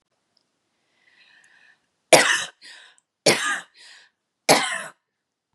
{
  "three_cough_length": "5.5 s",
  "three_cough_amplitude": 32768,
  "three_cough_signal_mean_std_ratio": 0.29,
  "survey_phase": "beta (2021-08-13 to 2022-03-07)",
  "age": "18-44",
  "gender": "Female",
  "wearing_mask": "No",
  "symptom_none": true,
  "smoker_status": "Ex-smoker",
  "respiratory_condition_asthma": false,
  "respiratory_condition_other": false,
  "recruitment_source": "REACT",
  "submission_delay": "0 days",
  "covid_test_result": "Negative",
  "covid_test_method": "RT-qPCR",
  "covid_ct_value": 37.5,
  "covid_ct_gene": "N gene",
  "influenza_a_test_result": "Negative",
  "influenza_b_test_result": "Negative"
}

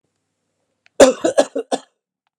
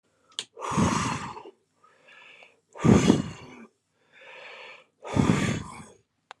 {
  "cough_length": "2.4 s",
  "cough_amplitude": 32768,
  "cough_signal_mean_std_ratio": 0.28,
  "exhalation_length": "6.4 s",
  "exhalation_amplitude": 19946,
  "exhalation_signal_mean_std_ratio": 0.4,
  "survey_phase": "alpha (2021-03-01 to 2021-08-12)",
  "age": "45-64",
  "gender": "Male",
  "wearing_mask": "No",
  "symptom_none": true,
  "smoker_status": "Current smoker (11 or more cigarettes per day)",
  "respiratory_condition_asthma": false,
  "respiratory_condition_other": false,
  "recruitment_source": "REACT",
  "submission_delay": "3 days",
  "covid_test_result": "Negative",
  "covid_test_method": "RT-qPCR"
}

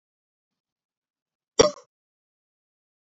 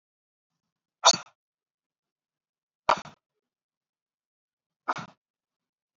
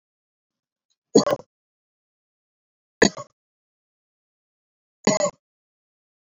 {
  "cough_length": "3.2 s",
  "cough_amplitude": 28635,
  "cough_signal_mean_std_ratio": 0.12,
  "exhalation_length": "6.0 s",
  "exhalation_amplitude": 22207,
  "exhalation_signal_mean_std_ratio": 0.14,
  "three_cough_length": "6.3 s",
  "three_cough_amplitude": 27500,
  "three_cough_signal_mean_std_ratio": 0.19,
  "survey_phase": "beta (2021-08-13 to 2022-03-07)",
  "age": "18-44",
  "gender": "Male",
  "wearing_mask": "No",
  "symptom_none": true,
  "symptom_onset": "8 days",
  "smoker_status": "Never smoked",
  "respiratory_condition_asthma": false,
  "respiratory_condition_other": false,
  "recruitment_source": "REACT",
  "submission_delay": "1 day",
  "covid_test_result": "Negative",
  "covid_test_method": "RT-qPCR",
  "influenza_a_test_result": "Negative",
  "influenza_b_test_result": "Negative"
}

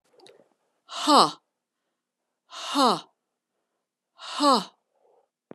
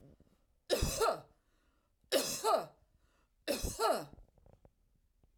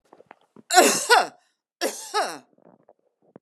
{
  "exhalation_length": "5.5 s",
  "exhalation_amplitude": 24120,
  "exhalation_signal_mean_std_ratio": 0.3,
  "three_cough_length": "5.4 s",
  "three_cough_amplitude": 4026,
  "three_cough_signal_mean_std_ratio": 0.43,
  "cough_length": "3.4 s",
  "cough_amplitude": 29999,
  "cough_signal_mean_std_ratio": 0.36,
  "survey_phase": "alpha (2021-03-01 to 2021-08-12)",
  "age": "45-64",
  "gender": "Female",
  "wearing_mask": "No",
  "symptom_cough_any": true,
  "symptom_abdominal_pain": true,
  "symptom_fatigue": true,
  "symptom_headache": true,
  "symptom_onset": "12 days",
  "smoker_status": "Never smoked",
  "respiratory_condition_asthma": false,
  "respiratory_condition_other": false,
  "recruitment_source": "REACT",
  "submission_delay": "3 days",
  "covid_test_result": "Negative",
  "covid_test_method": "RT-qPCR"
}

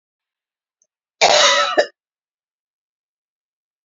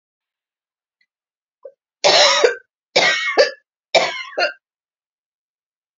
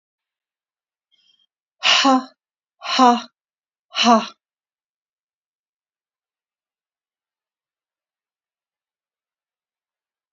{
  "cough_length": "3.8 s",
  "cough_amplitude": 32094,
  "cough_signal_mean_std_ratio": 0.31,
  "three_cough_length": "6.0 s",
  "three_cough_amplitude": 30168,
  "three_cough_signal_mean_std_ratio": 0.38,
  "exhalation_length": "10.3 s",
  "exhalation_amplitude": 26848,
  "exhalation_signal_mean_std_ratio": 0.23,
  "survey_phase": "beta (2021-08-13 to 2022-03-07)",
  "age": "45-64",
  "gender": "Female",
  "wearing_mask": "No",
  "symptom_cough_any": true,
  "symptom_runny_or_blocked_nose": true,
  "symptom_sore_throat": true,
  "symptom_fatigue": true,
  "symptom_headache": true,
  "smoker_status": "Ex-smoker",
  "respiratory_condition_asthma": false,
  "respiratory_condition_other": false,
  "recruitment_source": "Test and Trace",
  "submission_delay": "2 days",
  "covid_test_result": "Positive",
  "covid_test_method": "LFT"
}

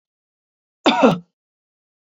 {
  "cough_length": "2.0 s",
  "cough_amplitude": 26678,
  "cough_signal_mean_std_ratio": 0.3,
  "survey_phase": "beta (2021-08-13 to 2022-03-07)",
  "age": "65+",
  "gender": "Female",
  "wearing_mask": "No",
  "symptom_none": true,
  "smoker_status": "Ex-smoker",
  "respiratory_condition_asthma": false,
  "respiratory_condition_other": false,
  "recruitment_source": "REACT",
  "submission_delay": "2 days",
  "covid_test_result": "Negative",
  "covid_test_method": "RT-qPCR",
  "influenza_a_test_result": "Negative",
  "influenza_b_test_result": "Negative"
}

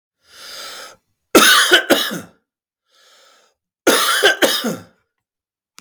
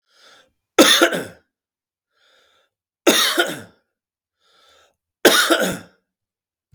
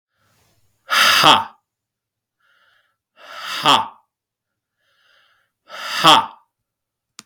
{
  "cough_length": "5.8 s",
  "cough_amplitude": 32768,
  "cough_signal_mean_std_ratio": 0.42,
  "three_cough_length": "6.7 s",
  "three_cough_amplitude": 32768,
  "three_cough_signal_mean_std_ratio": 0.34,
  "exhalation_length": "7.3 s",
  "exhalation_amplitude": 32766,
  "exhalation_signal_mean_std_ratio": 0.31,
  "survey_phase": "beta (2021-08-13 to 2022-03-07)",
  "age": "45-64",
  "gender": "Male",
  "wearing_mask": "No",
  "symptom_cough_any": true,
  "symptom_runny_or_blocked_nose": true,
  "symptom_sore_throat": true,
  "symptom_fever_high_temperature": true,
  "symptom_headache": true,
  "symptom_onset": "4 days",
  "smoker_status": "Current smoker (e-cigarettes or vapes only)",
  "respiratory_condition_asthma": false,
  "respiratory_condition_other": false,
  "recruitment_source": "Test and Trace",
  "submission_delay": "2 days",
  "covid_test_result": "Positive",
  "covid_test_method": "RT-qPCR",
  "covid_ct_value": 16.9,
  "covid_ct_gene": "N gene"
}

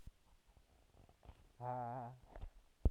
{
  "exhalation_length": "2.9 s",
  "exhalation_amplitude": 3128,
  "exhalation_signal_mean_std_ratio": 0.34,
  "survey_phase": "alpha (2021-03-01 to 2021-08-12)",
  "age": "18-44",
  "gender": "Male",
  "wearing_mask": "Yes",
  "symptom_cough_any": true,
  "symptom_new_continuous_cough": true,
  "symptom_fever_high_temperature": true,
  "symptom_headache": true,
  "symptom_change_to_sense_of_smell_or_taste": true,
  "symptom_loss_of_taste": true,
  "symptom_onset": "2 days",
  "smoker_status": "Current smoker (1 to 10 cigarettes per day)",
  "respiratory_condition_asthma": false,
  "respiratory_condition_other": false,
  "recruitment_source": "Test and Trace",
  "submission_delay": "2 days",
  "covid_test_result": "Positive",
  "covid_test_method": "RT-qPCR",
  "covid_ct_value": 15.4,
  "covid_ct_gene": "ORF1ab gene",
  "covid_ct_mean": 15.7,
  "covid_viral_load": "6900000 copies/ml",
  "covid_viral_load_category": "High viral load (>1M copies/ml)"
}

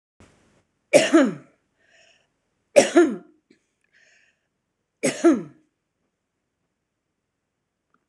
{
  "three_cough_length": "8.1 s",
  "three_cough_amplitude": 26028,
  "three_cough_signal_mean_std_ratio": 0.26,
  "survey_phase": "beta (2021-08-13 to 2022-03-07)",
  "age": "45-64",
  "gender": "Female",
  "wearing_mask": "No",
  "symptom_none": true,
  "smoker_status": "Ex-smoker",
  "respiratory_condition_asthma": false,
  "respiratory_condition_other": false,
  "recruitment_source": "REACT",
  "submission_delay": "1 day",
  "covid_test_result": "Negative",
  "covid_test_method": "RT-qPCR",
  "influenza_a_test_result": "Negative",
  "influenza_b_test_result": "Negative"
}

